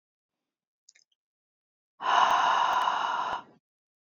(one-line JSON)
{"exhalation_length": "4.2 s", "exhalation_amplitude": 10742, "exhalation_signal_mean_std_ratio": 0.48, "survey_phase": "beta (2021-08-13 to 2022-03-07)", "age": "18-44", "gender": "Female", "wearing_mask": "No", "symptom_none": true, "smoker_status": "Never smoked", "respiratory_condition_asthma": false, "respiratory_condition_other": false, "recruitment_source": "REACT", "submission_delay": "1 day", "covid_test_result": "Negative", "covid_test_method": "RT-qPCR", "influenza_a_test_result": "Negative", "influenza_b_test_result": "Negative"}